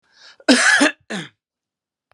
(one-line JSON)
{"cough_length": "2.1 s", "cough_amplitude": 31277, "cough_signal_mean_std_ratio": 0.4, "survey_phase": "beta (2021-08-13 to 2022-03-07)", "age": "45-64", "gender": "Male", "wearing_mask": "No", "symptom_none": true, "smoker_status": "Ex-smoker", "respiratory_condition_asthma": false, "respiratory_condition_other": false, "recruitment_source": "REACT", "submission_delay": "1 day", "covid_test_result": "Negative", "covid_test_method": "RT-qPCR"}